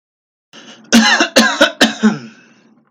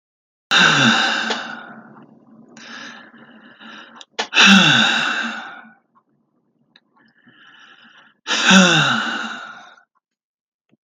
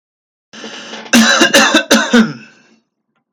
{"three_cough_length": "2.9 s", "three_cough_amplitude": 32768, "three_cough_signal_mean_std_ratio": 0.48, "exhalation_length": "10.8 s", "exhalation_amplitude": 32768, "exhalation_signal_mean_std_ratio": 0.43, "cough_length": "3.3 s", "cough_amplitude": 32768, "cough_signal_mean_std_ratio": 0.51, "survey_phase": "beta (2021-08-13 to 2022-03-07)", "age": "18-44", "gender": "Male", "wearing_mask": "No", "symptom_none": true, "smoker_status": "Never smoked", "respiratory_condition_asthma": true, "respiratory_condition_other": false, "recruitment_source": "REACT", "submission_delay": "2 days", "covid_test_result": "Negative", "covid_test_method": "RT-qPCR", "influenza_a_test_result": "Negative", "influenza_b_test_result": "Negative"}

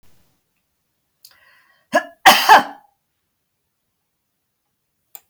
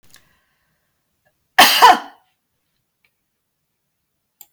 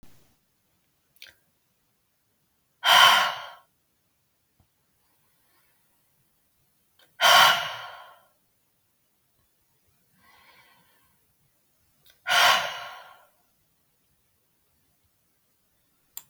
{"cough_length": "5.3 s", "cough_amplitude": 32768, "cough_signal_mean_std_ratio": 0.22, "three_cough_length": "4.5 s", "three_cough_amplitude": 32768, "three_cough_signal_mean_std_ratio": 0.23, "exhalation_length": "16.3 s", "exhalation_amplitude": 21948, "exhalation_signal_mean_std_ratio": 0.24, "survey_phase": "beta (2021-08-13 to 2022-03-07)", "age": "65+", "gender": "Female", "wearing_mask": "No", "symptom_none": true, "smoker_status": "Never smoked", "respiratory_condition_asthma": false, "respiratory_condition_other": false, "recruitment_source": "REACT", "submission_delay": "1 day", "covid_test_result": "Negative", "covid_test_method": "RT-qPCR", "influenza_a_test_result": "Negative", "influenza_b_test_result": "Negative"}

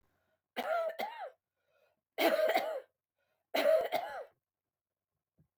{"three_cough_length": "5.6 s", "three_cough_amplitude": 5659, "three_cough_signal_mean_std_ratio": 0.45, "survey_phase": "beta (2021-08-13 to 2022-03-07)", "age": "65+", "gender": "Female", "wearing_mask": "No", "symptom_none": true, "symptom_onset": "8 days", "smoker_status": "Never smoked", "respiratory_condition_asthma": false, "respiratory_condition_other": false, "recruitment_source": "REACT", "submission_delay": "6 days", "covid_test_result": "Negative", "covid_test_method": "RT-qPCR"}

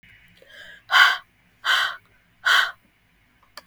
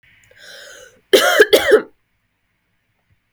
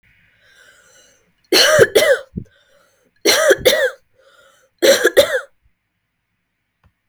{"exhalation_length": "3.7 s", "exhalation_amplitude": 29885, "exhalation_signal_mean_std_ratio": 0.37, "cough_length": "3.3 s", "cough_amplitude": 32768, "cough_signal_mean_std_ratio": 0.34, "three_cough_length": "7.1 s", "three_cough_amplitude": 32768, "three_cough_signal_mean_std_ratio": 0.4, "survey_phase": "beta (2021-08-13 to 2022-03-07)", "age": "18-44", "gender": "Female", "wearing_mask": "No", "symptom_none": true, "smoker_status": "Ex-smoker", "respiratory_condition_asthma": false, "respiratory_condition_other": false, "recruitment_source": "REACT", "submission_delay": "2 days", "covid_test_result": "Negative", "covid_test_method": "RT-qPCR", "influenza_a_test_result": "Negative", "influenza_b_test_result": "Negative"}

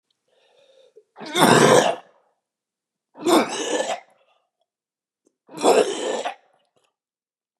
{"three_cough_length": "7.6 s", "three_cough_amplitude": 32600, "three_cough_signal_mean_std_ratio": 0.37, "survey_phase": "beta (2021-08-13 to 2022-03-07)", "age": "65+", "gender": "Male", "wearing_mask": "No", "symptom_cough_any": true, "symptom_fatigue": true, "symptom_onset": "8 days", "smoker_status": "Never smoked", "respiratory_condition_asthma": true, "respiratory_condition_other": false, "recruitment_source": "REACT", "submission_delay": "3 days", "covid_test_result": "Negative", "covid_test_method": "RT-qPCR", "influenza_a_test_result": "Negative", "influenza_b_test_result": "Negative"}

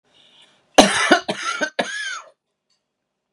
{"three_cough_length": "3.3 s", "three_cough_amplitude": 32768, "three_cough_signal_mean_std_ratio": 0.36, "survey_phase": "beta (2021-08-13 to 2022-03-07)", "age": "18-44", "gender": "Female", "wearing_mask": "No", "symptom_none": true, "smoker_status": "Current smoker (11 or more cigarettes per day)", "respiratory_condition_asthma": false, "respiratory_condition_other": false, "recruitment_source": "REACT", "submission_delay": "1 day", "covid_test_result": "Negative", "covid_test_method": "RT-qPCR"}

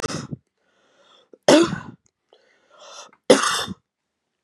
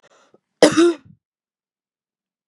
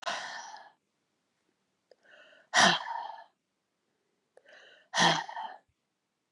{"three_cough_length": "4.4 s", "three_cough_amplitude": 32002, "three_cough_signal_mean_std_ratio": 0.3, "cough_length": "2.5 s", "cough_amplitude": 32768, "cough_signal_mean_std_ratio": 0.27, "exhalation_length": "6.3 s", "exhalation_amplitude": 10528, "exhalation_signal_mean_std_ratio": 0.31, "survey_phase": "beta (2021-08-13 to 2022-03-07)", "age": "45-64", "gender": "Female", "wearing_mask": "No", "symptom_runny_or_blocked_nose": true, "symptom_headache": true, "smoker_status": "Never smoked", "respiratory_condition_asthma": false, "respiratory_condition_other": false, "recruitment_source": "Test and Trace", "submission_delay": "1 day", "covid_test_result": "Positive", "covid_test_method": "RT-qPCR"}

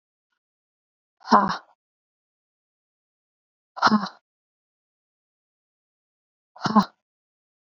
{"exhalation_length": "7.8 s", "exhalation_amplitude": 27073, "exhalation_signal_mean_std_ratio": 0.21, "survey_phase": "beta (2021-08-13 to 2022-03-07)", "age": "18-44", "gender": "Female", "wearing_mask": "No", "symptom_cough_any": true, "symptom_runny_or_blocked_nose": true, "symptom_sore_throat": true, "symptom_fatigue": true, "symptom_fever_high_temperature": true, "symptom_headache": true, "symptom_other": true, "smoker_status": "Never smoked", "respiratory_condition_asthma": false, "respiratory_condition_other": false, "recruitment_source": "Test and Trace", "submission_delay": "1 day", "covid_test_result": "Positive", "covid_test_method": "LFT"}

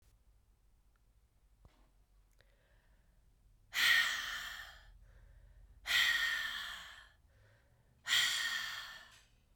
{"exhalation_length": "9.6 s", "exhalation_amplitude": 5204, "exhalation_signal_mean_std_ratio": 0.42, "survey_phase": "beta (2021-08-13 to 2022-03-07)", "age": "18-44", "gender": "Female", "wearing_mask": "No", "symptom_cough_any": true, "symptom_runny_or_blocked_nose": true, "symptom_fatigue": true, "smoker_status": "Never smoked", "respiratory_condition_asthma": false, "respiratory_condition_other": false, "recruitment_source": "Test and Trace", "submission_delay": "2 days", "covid_test_result": "Positive", "covid_test_method": "RT-qPCR", "covid_ct_value": 20.4, "covid_ct_gene": "ORF1ab gene"}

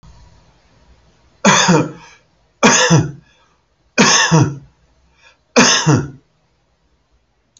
{"cough_length": "7.6 s", "cough_amplitude": 32768, "cough_signal_mean_std_ratio": 0.43, "survey_phase": "alpha (2021-03-01 to 2021-08-12)", "age": "65+", "gender": "Male", "wearing_mask": "No", "symptom_none": true, "smoker_status": "Ex-smoker", "respiratory_condition_asthma": false, "respiratory_condition_other": false, "recruitment_source": "REACT", "submission_delay": "3 days", "covid_test_result": "Negative", "covid_test_method": "RT-qPCR"}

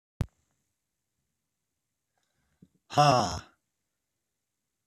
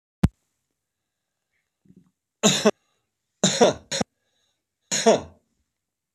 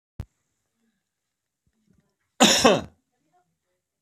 {"exhalation_length": "4.9 s", "exhalation_amplitude": 12944, "exhalation_signal_mean_std_ratio": 0.21, "three_cough_length": "6.1 s", "three_cough_amplitude": 22845, "three_cough_signal_mean_std_ratio": 0.29, "cough_length": "4.0 s", "cough_amplitude": 24827, "cough_signal_mean_std_ratio": 0.24, "survey_phase": "beta (2021-08-13 to 2022-03-07)", "age": "65+", "gender": "Male", "wearing_mask": "No", "symptom_cough_any": true, "symptom_diarrhoea": true, "symptom_fatigue": true, "symptom_headache": true, "symptom_change_to_sense_of_smell_or_taste": true, "smoker_status": "Never smoked", "respiratory_condition_asthma": false, "respiratory_condition_other": false, "recruitment_source": "Test and Trace", "submission_delay": "-1 day", "covid_test_result": "Positive", "covid_test_method": "LFT"}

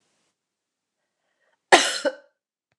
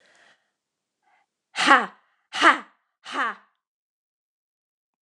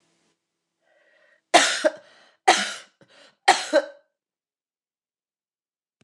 {"cough_length": "2.8 s", "cough_amplitude": 29203, "cough_signal_mean_std_ratio": 0.22, "exhalation_length": "5.0 s", "exhalation_amplitude": 29203, "exhalation_signal_mean_std_ratio": 0.25, "three_cough_length": "6.0 s", "three_cough_amplitude": 29022, "three_cough_signal_mean_std_ratio": 0.26, "survey_phase": "beta (2021-08-13 to 2022-03-07)", "age": "45-64", "gender": "Female", "wearing_mask": "No", "symptom_cough_any": true, "symptom_new_continuous_cough": true, "symptom_runny_or_blocked_nose": true, "symptom_abdominal_pain": true, "symptom_fatigue": true, "symptom_fever_high_temperature": true, "symptom_headache": true, "symptom_change_to_sense_of_smell_or_taste": true, "symptom_loss_of_taste": true, "symptom_other": true, "symptom_onset": "3 days", "smoker_status": "Never smoked", "respiratory_condition_asthma": false, "respiratory_condition_other": false, "recruitment_source": "Test and Trace", "submission_delay": "2 days", "covid_test_result": "Positive", "covid_test_method": "RT-qPCR", "covid_ct_value": 15.4, "covid_ct_gene": "ORF1ab gene", "covid_ct_mean": 15.9, "covid_viral_load": "6200000 copies/ml", "covid_viral_load_category": "High viral load (>1M copies/ml)"}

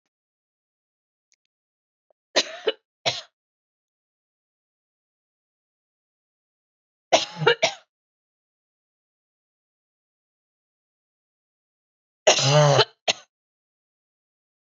{"three_cough_length": "14.7 s", "three_cough_amplitude": 26397, "three_cough_signal_mean_std_ratio": 0.21, "survey_phase": "beta (2021-08-13 to 2022-03-07)", "age": "18-44", "gender": "Female", "wearing_mask": "No", "symptom_none": true, "smoker_status": "Never smoked", "respiratory_condition_asthma": true, "respiratory_condition_other": false, "recruitment_source": "REACT", "submission_delay": "2 days", "covid_test_result": "Negative", "covid_test_method": "RT-qPCR", "influenza_a_test_result": "Negative", "influenza_b_test_result": "Negative"}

